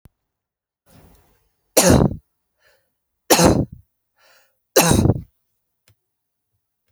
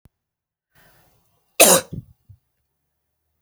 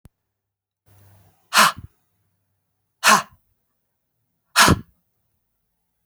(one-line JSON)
{"three_cough_length": "6.9 s", "three_cough_amplitude": 32768, "three_cough_signal_mean_std_ratio": 0.31, "cough_length": "3.4 s", "cough_amplitude": 32768, "cough_signal_mean_std_ratio": 0.21, "exhalation_length": "6.1 s", "exhalation_amplitude": 32605, "exhalation_signal_mean_std_ratio": 0.24, "survey_phase": "beta (2021-08-13 to 2022-03-07)", "age": "18-44", "gender": "Female", "wearing_mask": "No", "symptom_cough_any": true, "symptom_runny_or_blocked_nose": true, "symptom_fatigue": true, "symptom_other": true, "symptom_onset": "3 days", "smoker_status": "Never smoked", "respiratory_condition_asthma": false, "respiratory_condition_other": false, "recruitment_source": "Test and Trace", "submission_delay": "1 day", "covid_test_result": "Positive", "covid_test_method": "RT-qPCR", "covid_ct_value": 26.0, "covid_ct_gene": "N gene"}